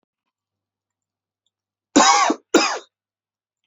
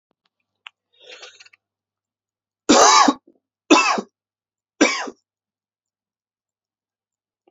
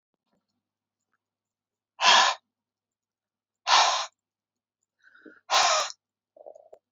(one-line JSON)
{"cough_length": "3.7 s", "cough_amplitude": 26850, "cough_signal_mean_std_ratio": 0.31, "three_cough_length": "7.5 s", "three_cough_amplitude": 32768, "three_cough_signal_mean_std_ratio": 0.28, "exhalation_length": "6.9 s", "exhalation_amplitude": 19567, "exhalation_signal_mean_std_ratio": 0.31, "survey_phase": "beta (2021-08-13 to 2022-03-07)", "age": "18-44", "gender": "Male", "wearing_mask": "No", "symptom_cough_any": true, "symptom_runny_or_blocked_nose": true, "symptom_shortness_of_breath": true, "symptom_fatigue": true, "symptom_change_to_sense_of_smell_or_taste": true, "symptom_other": true, "symptom_onset": "5 days", "smoker_status": "Current smoker (e-cigarettes or vapes only)", "respiratory_condition_asthma": false, "respiratory_condition_other": false, "recruitment_source": "Test and Trace", "submission_delay": "2 days", "covid_test_result": "Positive", "covid_test_method": "RT-qPCR", "covid_ct_value": 27.6, "covid_ct_gene": "ORF1ab gene"}